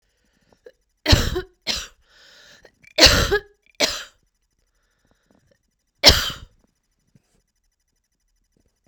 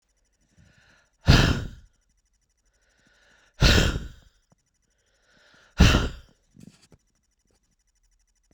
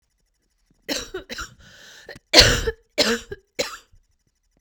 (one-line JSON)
{"three_cough_length": "8.9 s", "three_cough_amplitude": 32768, "three_cough_signal_mean_std_ratio": 0.26, "exhalation_length": "8.5 s", "exhalation_amplitude": 25453, "exhalation_signal_mean_std_ratio": 0.27, "cough_length": "4.6 s", "cough_amplitude": 32768, "cough_signal_mean_std_ratio": 0.31, "survey_phase": "beta (2021-08-13 to 2022-03-07)", "age": "45-64", "gender": "Female", "wearing_mask": "No", "symptom_cough_any": true, "symptom_runny_or_blocked_nose": true, "symptom_shortness_of_breath": true, "symptom_sore_throat": true, "symptom_fatigue": true, "symptom_headache": true, "symptom_change_to_sense_of_smell_or_taste": true, "symptom_loss_of_taste": true, "smoker_status": "Never smoked", "respiratory_condition_asthma": false, "respiratory_condition_other": false, "recruitment_source": "Test and Trace", "submission_delay": "3 days", "covid_test_result": "Positive", "covid_test_method": "RT-qPCR", "covid_ct_value": 18.3, "covid_ct_gene": "ORF1ab gene", "covid_ct_mean": 19.0, "covid_viral_load": "570000 copies/ml", "covid_viral_load_category": "Low viral load (10K-1M copies/ml)"}